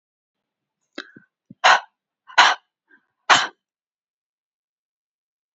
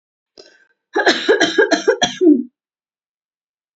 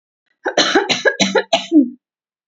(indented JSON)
{
  "exhalation_length": "5.5 s",
  "exhalation_amplitude": 32767,
  "exhalation_signal_mean_std_ratio": 0.23,
  "three_cough_length": "3.8 s",
  "three_cough_amplitude": 29902,
  "three_cough_signal_mean_std_ratio": 0.44,
  "cough_length": "2.5 s",
  "cough_amplitude": 31468,
  "cough_signal_mean_std_ratio": 0.52,
  "survey_phase": "beta (2021-08-13 to 2022-03-07)",
  "age": "18-44",
  "gender": "Female",
  "wearing_mask": "No",
  "symptom_none": true,
  "smoker_status": "Never smoked",
  "respiratory_condition_asthma": true,
  "respiratory_condition_other": false,
  "recruitment_source": "Test and Trace",
  "submission_delay": "0 days",
  "covid_test_result": "Negative",
  "covid_test_method": "RT-qPCR"
}